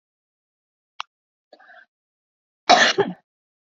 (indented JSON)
{
  "cough_length": "3.8 s",
  "cough_amplitude": 29435,
  "cough_signal_mean_std_ratio": 0.23,
  "survey_phase": "beta (2021-08-13 to 2022-03-07)",
  "age": "45-64",
  "gender": "Female",
  "wearing_mask": "No",
  "symptom_none": true,
  "smoker_status": "Never smoked",
  "respiratory_condition_asthma": false,
  "respiratory_condition_other": false,
  "recruitment_source": "REACT",
  "submission_delay": "5 days",
  "covid_test_result": "Negative",
  "covid_test_method": "RT-qPCR",
  "influenza_a_test_result": "Negative",
  "influenza_b_test_result": "Negative"
}